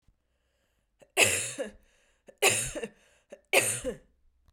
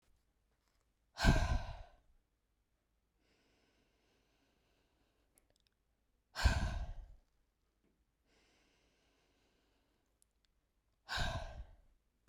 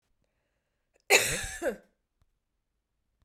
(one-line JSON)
{"three_cough_length": "4.5 s", "three_cough_amplitude": 17540, "three_cough_signal_mean_std_ratio": 0.37, "exhalation_length": "12.3 s", "exhalation_amplitude": 6614, "exhalation_signal_mean_std_ratio": 0.26, "cough_length": "3.2 s", "cough_amplitude": 15275, "cough_signal_mean_std_ratio": 0.27, "survey_phase": "beta (2021-08-13 to 2022-03-07)", "age": "45-64", "gender": "Female", "wearing_mask": "No", "symptom_cough_any": true, "symptom_fatigue": true, "symptom_onset": "3 days", "smoker_status": "Never smoked", "respiratory_condition_asthma": false, "respiratory_condition_other": false, "recruitment_source": "Test and Trace", "submission_delay": "2 days", "covid_test_result": "Positive", "covid_test_method": "RT-qPCR", "covid_ct_value": 33.6, "covid_ct_gene": "ORF1ab gene"}